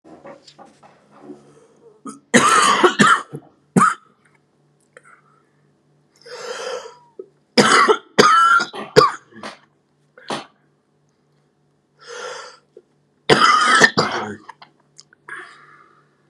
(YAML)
three_cough_length: 16.3 s
three_cough_amplitude: 32768
three_cough_signal_mean_std_ratio: 0.38
survey_phase: beta (2021-08-13 to 2022-03-07)
age: 18-44
gender: Male
wearing_mask: 'No'
symptom_cough_any: true
symptom_new_continuous_cough: true
symptom_runny_or_blocked_nose: true
symptom_shortness_of_breath: true
symptom_fatigue: true
symptom_headache: true
symptom_change_to_sense_of_smell_or_taste: true
symptom_onset: 5 days
smoker_status: Current smoker (11 or more cigarettes per day)
respiratory_condition_asthma: true
respiratory_condition_other: false
recruitment_source: Test and Trace
submission_delay: 1 day
covid_test_result: Negative
covid_test_method: RT-qPCR